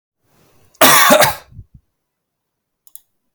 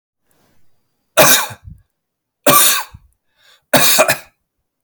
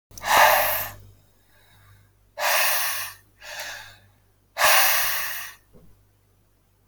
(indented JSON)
{
  "cough_length": "3.3 s",
  "cough_amplitude": 32768,
  "cough_signal_mean_std_ratio": 0.34,
  "three_cough_length": "4.8 s",
  "three_cough_amplitude": 32768,
  "three_cough_signal_mean_std_ratio": 0.39,
  "exhalation_length": "6.9 s",
  "exhalation_amplitude": 24162,
  "exhalation_signal_mean_std_ratio": 0.47,
  "survey_phase": "alpha (2021-03-01 to 2021-08-12)",
  "age": "18-44",
  "gender": "Male",
  "wearing_mask": "No",
  "symptom_none": true,
  "smoker_status": "Never smoked",
  "respiratory_condition_asthma": false,
  "respiratory_condition_other": false,
  "recruitment_source": "REACT",
  "submission_delay": "1 day",
  "covid_test_result": "Negative",
  "covid_test_method": "RT-qPCR"
}